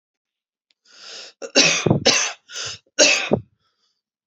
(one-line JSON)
{"three_cough_length": "4.3 s", "three_cough_amplitude": 32672, "three_cough_signal_mean_std_ratio": 0.41, "survey_phase": "beta (2021-08-13 to 2022-03-07)", "age": "18-44", "gender": "Female", "wearing_mask": "No", "symptom_cough_any": true, "symptom_fatigue": true, "symptom_headache": true, "symptom_change_to_sense_of_smell_or_taste": true, "symptom_onset": "3 days", "smoker_status": "Current smoker (e-cigarettes or vapes only)", "respiratory_condition_asthma": false, "respiratory_condition_other": false, "recruitment_source": "Test and Trace", "submission_delay": "2 days", "covid_test_result": "Positive", "covid_test_method": "RT-qPCR", "covid_ct_value": 18.0, "covid_ct_gene": "ORF1ab gene", "covid_ct_mean": 18.7, "covid_viral_load": "750000 copies/ml", "covid_viral_load_category": "Low viral load (10K-1M copies/ml)"}